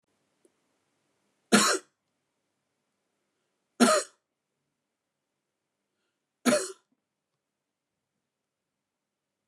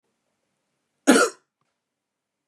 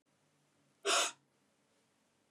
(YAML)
three_cough_length: 9.5 s
three_cough_amplitude: 16761
three_cough_signal_mean_std_ratio: 0.21
cough_length: 2.5 s
cough_amplitude: 25725
cough_signal_mean_std_ratio: 0.23
exhalation_length: 2.3 s
exhalation_amplitude: 4161
exhalation_signal_mean_std_ratio: 0.27
survey_phase: beta (2021-08-13 to 2022-03-07)
age: 18-44
gender: Male
wearing_mask: 'No'
symptom_runny_or_blocked_nose: true
smoker_status: Never smoked
respiratory_condition_asthma: true
respiratory_condition_other: false
recruitment_source: REACT
submission_delay: 0 days
covid_test_result: Negative
covid_test_method: RT-qPCR
influenza_a_test_result: Negative
influenza_b_test_result: Negative